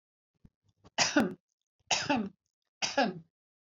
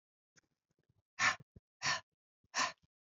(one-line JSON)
{"three_cough_length": "3.8 s", "three_cough_amplitude": 10748, "three_cough_signal_mean_std_ratio": 0.39, "exhalation_length": "3.1 s", "exhalation_amplitude": 4232, "exhalation_signal_mean_std_ratio": 0.31, "survey_phase": "alpha (2021-03-01 to 2021-08-12)", "age": "65+", "gender": "Female", "wearing_mask": "No", "symptom_none": true, "smoker_status": "Ex-smoker", "respiratory_condition_asthma": false, "respiratory_condition_other": false, "recruitment_source": "REACT", "submission_delay": "2 days", "covid_test_result": "Negative", "covid_test_method": "RT-qPCR"}